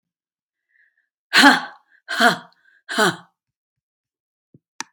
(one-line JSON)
{"exhalation_length": "4.9 s", "exhalation_amplitude": 32767, "exhalation_signal_mean_std_ratio": 0.28, "survey_phase": "beta (2021-08-13 to 2022-03-07)", "age": "45-64", "gender": "Female", "wearing_mask": "Yes", "symptom_cough_any": true, "symptom_sore_throat": true, "symptom_fatigue": true, "symptom_headache": true, "symptom_onset": "2 days", "smoker_status": "Never smoked", "respiratory_condition_asthma": false, "respiratory_condition_other": false, "recruitment_source": "Test and Trace", "submission_delay": "1 day", "covid_test_result": "Positive", "covid_test_method": "RT-qPCR", "covid_ct_value": 20.9, "covid_ct_gene": "ORF1ab gene"}